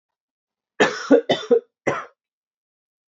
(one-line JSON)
{"three_cough_length": "3.1 s", "three_cough_amplitude": 25873, "three_cough_signal_mean_std_ratio": 0.33, "survey_phase": "beta (2021-08-13 to 2022-03-07)", "age": "18-44", "gender": "Male", "wearing_mask": "No", "symptom_cough_any": true, "symptom_new_continuous_cough": true, "symptom_runny_or_blocked_nose": true, "symptom_shortness_of_breath": true, "symptom_sore_throat": true, "symptom_fever_high_temperature": true, "symptom_headache": true, "symptom_onset": "4 days", "smoker_status": "Never smoked", "respiratory_condition_asthma": false, "respiratory_condition_other": false, "recruitment_source": "Test and Trace", "submission_delay": "2 days", "covid_test_result": "Positive", "covid_test_method": "RT-qPCR"}